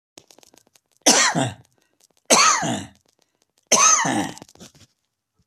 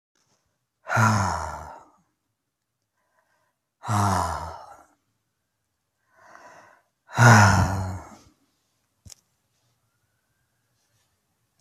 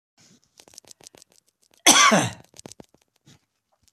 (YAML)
three_cough_length: 5.5 s
three_cough_amplitude: 29273
three_cough_signal_mean_std_ratio: 0.42
exhalation_length: 11.6 s
exhalation_amplitude: 25468
exhalation_signal_mean_std_ratio: 0.3
cough_length: 3.9 s
cough_amplitude: 32767
cough_signal_mean_std_ratio: 0.26
survey_phase: beta (2021-08-13 to 2022-03-07)
age: 65+
gender: Male
wearing_mask: 'No'
symptom_none: true
smoker_status: Ex-smoker
respiratory_condition_asthma: false
respiratory_condition_other: false
recruitment_source: REACT
submission_delay: 5 days
covid_test_result: Negative
covid_test_method: RT-qPCR